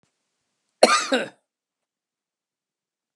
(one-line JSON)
{"cough_length": "3.2 s", "cough_amplitude": 32768, "cough_signal_mean_std_ratio": 0.23, "survey_phase": "beta (2021-08-13 to 2022-03-07)", "age": "45-64", "gender": "Male", "wearing_mask": "No", "symptom_none": true, "smoker_status": "Ex-smoker", "respiratory_condition_asthma": false, "respiratory_condition_other": false, "recruitment_source": "REACT", "submission_delay": "20 days", "covid_test_result": "Negative", "covid_test_method": "RT-qPCR", "influenza_a_test_result": "Negative", "influenza_b_test_result": "Negative"}